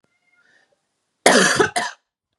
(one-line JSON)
{"cough_length": "2.4 s", "cough_amplitude": 32768, "cough_signal_mean_std_ratio": 0.37, "survey_phase": "beta (2021-08-13 to 2022-03-07)", "age": "18-44", "gender": "Female", "wearing_mask": "No", "symptom_none": true, "smoker_status": "Never smoked", "respiratory_condition_asthma": false, "respiratory_condition_other": false, "recruitment_source": "REACT", "submission_delay": "1 day", "covid_test_result": "Negative", "covid_test_method": "RT-qPCR", "influenza_a_test_result": "Negative", "influenza_b_test_result": "Negative"}